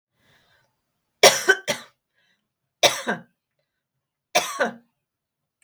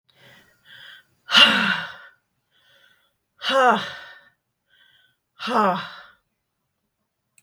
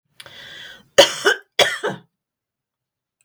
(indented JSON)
{
  "three_cough_length": "5.6 s",
  "three_cough_amplitude": 32768,
  "three_cough_signal_mean_std_ratio": 0.26,
  "exhalation_length": "7.4 s",
  "exhalation_amplitude": 32766,
  "exhalation_signal_mean_std_ratio": 0.34,
  "cough_length": "3.2 s",
  "cough_amplitude": 32768,
  "cough_signal_mean_std_ratio": 0.3,
  "survey_phase": "beta (2021-08-13 to 2022-03-07)",
  "age": "65+",
  "gender": "Female",
  "wearing_mask": "No",
  "symptom_none": true,
  "smoker_status": "Never smoked",
  "respiratory_condition_asthma": false,
  "respiratory_condition_other": false,
  "recruitment_source": "REACT",
  "submission_delay": "1 day",
  "covid_test_result": "Negative",
  "covid_test_method": "RT-qPCR",
  "influenza_a_test_result": "Negative",
  "influenza_b_test_result": "Negative"
}